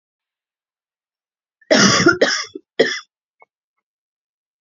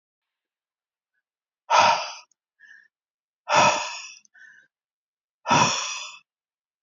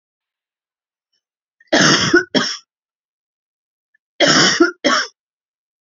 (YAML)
cough_length: 4.6 s
cough_amplitude: 29061
cough_signal_mean_std_ratio: 0.33
exhalation_length: 6.8 s
exhalation_amplitude: 21737
exhalation_signal_mean_std_ratio: 0.34
three_cough_length: 5.8 s
three_cough_amplitude: 31203
three_cough_signal_mean_std_ratio: 0.39
survey_phase: alpha (2021-03-01 to 2021-08-12)
age: 45-64
gender: Female
wearing_mask: 'Yes'
symptom_cough_any: true
symptom_fatigue: true
symptom_fever_high_temperature: true
symptom_onset: 3 days
smoker_status: Never smoked
respiratory_condition_asthma: false
respiratory_condition_other: false
recruitment_source: Test and Trace
submission_delay: 2 days
covid_test_result: Positive
covid_test_method: RT-qPCR
covid_ct_value: 18.0
covid_ct_gene: ORF1ab gene